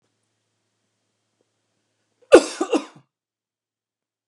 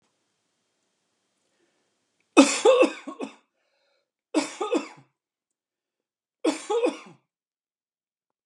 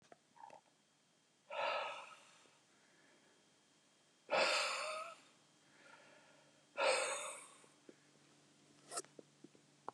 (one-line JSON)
{"cough_length": "4.3 s", "cough_amplitude": 32768, "cough_signal_mean_std_ratio": 0.16, "three_cough_length": "8.5 s", "three_cough_amplitude": 27741, "three_cough_signal_mean_std_ratio": 0.28, "exhalation_length": "9.9 s", "exhalation_amplitude": 2504, "exhalation_signal_mean_std_ratio": 0.39, "survey_phase": "beta (2021-08-13 to 2022-03-07)", "age": "45-64", "gender": "Male", "wearing_mask": "No", "symptom_none": true, "smoker_status": "Never smoked", "respiratory_condition_asthma": false, "respiratory_condition_other": false, "recruitment_source": "REACT", "submission_delay": "2 days", "covid_test_result": "Negative", "covid_test_method": "RT-qPCR", "influenza_a_test_result": "Negative", "influenza_b_test_result": "Negative"}